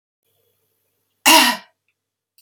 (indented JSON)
{
  "cough_length": "2.4 s",
  "cough_amplitude": 32768,
  "cough_signal_mean_std_ratio": 0.27,
  "survey_phase": "beta (2021-08-13 to 2022-03-07)",
  "age": "45-64",
  "gender": "Female",
  "wearing_mask": "No",
  "symptom_none": true,
  "smoker_status": "Ex-smoker",
  "respiratory_condition_asthma": false,
  "respiratory_condition_other": false,
  "recruitment_source": "REACT",
  "submission_delay": "1 day",
  "covid_test_result": "Negative",
  "covid_test_method": "RT-qPCR",
  "influenza_a_test_result": "Unknown/Void",
  "influenza_b_test_result": "Unknown/Void"
}